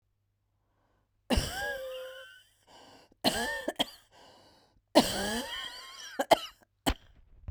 {
  "three_cough_length": "7.5 s",
  "three_cough_amplitude": 15428,
  "three_cough_signal_mean_std_ratio": 0.37,
  "survey_phase": "beta (2021-08-13 to 2022-03-07)",
  "age": "45-64",
  "gender": "Female",
  "wearing_mask": "No",
  "symptom_fatigue": true,
  "smoker_status": "Ex-smoker",
  "respiratory_condition_asthma": false,
  "respiratory_condition_other": true,
  "recruitment_source": "REACT",
  "submission_delay": "16 days",
  "covid_test_result": "Negative",
  "covid_test_method": "RT-qPCR",
  "influenza_a_test_result": "Negative",
  "influenza_b_test_result": "Negative"
}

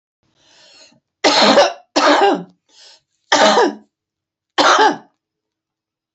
{
  "three_cough_length": "6.1 s",
  "three_cough_amplitude": 32768,
  "three_cough_signal_mean_std_ratio": 0.45,
  "survey_phase": "beta (2021-08-13 to 2022-03-07)",
  "age": "65+",
  "gender": "Female",
  "wearing_mask": "No",
  "symptom_none": true,
  "smoker_status": "Ex-smoker",
  "respiratory_condition_asthma": false,
  "respiratory_condition_other": false,
  "recruitment_source": "REACT",
  "submission_delay": "1 day",
  "covid_test_result": "Negative",
  "covid_test_method": "RT-qPCR"
}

